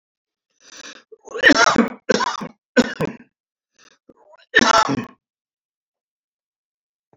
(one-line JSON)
{"cough_length": "7.2 s", "cough_amplitude": 28918, "cough_signal_mean_std_ratio": 0.33, "survey_phase": "beta (2021-08-13 to 2022-03-07)", "age": "65+", "gender": "Male", "wearing_mask": "No", "symptom_none": true, "smoker_status": "Ex-smoker", "respiratory_condition_asthma": true, "respiratory_condition_other": false, "recruitment_source": "REACT", "submission_delay": "1 day", "covid_test_result": "Negative", "covid_test_method": "RT-qPCR"}